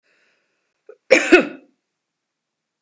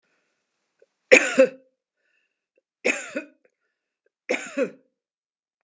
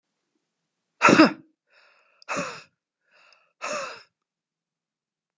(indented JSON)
{
  "cough_length": "2.8 s",
  "cough_amplitude": 32768,
  "cough_signal_mean_std_ratio": 0.24,
  "three_cough_length": "5.6 s",
  "three_cough_amplitude": 32579,
  "three_cough_signal_mean_std_ratio": 0.24,
  "exhalation_length": "5.4 s",
  "exhalation_amplitude": 27570,
  "exhalation_signal_mean_std_ratio": 0.23,
  "survey_phase": "beta (2021-08-13 to 2022-03-07)",
  "age": "65+",
  "gender": "Female",
  "wearing_mask": "No",
  "symptom_none": true,
  "smoker_status": "Never smoked",
  "respiratory_condition_asthma": false,
  "respiratory_condition_other": false,
  "recruitment_source": "REACT",
  "submission_delay": "2 days",
  "covid_test_result": "Negative",
  "covid_test_method": "RT-qPCR",
  "influenza_a_test_result": "Negative",
  "influenza_b_test_result": "Negative"
}